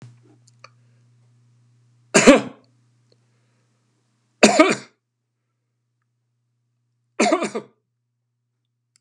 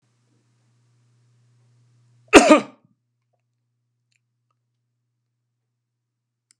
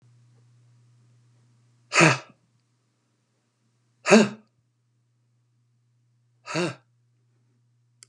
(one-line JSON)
{"three_cough_length": "9.0 s", "three_cough_amplitude": 32768, "three_cough_signal_mean_std_ratio": 0.23, "cough_length": "6.6 s", "cough_amplitude": 32768, "cough_signal_mean_std_ratio": 0.15, "exhalation_length": "8.1 s", "exhalation_amplitude": 28133, "exhalation_signal_mean_std_ratio": 0.21, "survey_phase": "beta (2021-08-13 to 2022-03-07)", "age": "65+", "gender": "Male", "wearing_mask": "No", "symptom_none": true, "smoker_status": "Ex-smoker", "respiratory_condition_asthma": false, "respiratory_condition_other": false, "recruitment_source": "REACT", "submission_delay": "2 days", "covid_test_result": "Negative", "covid_test_method": "RT-qPCR"}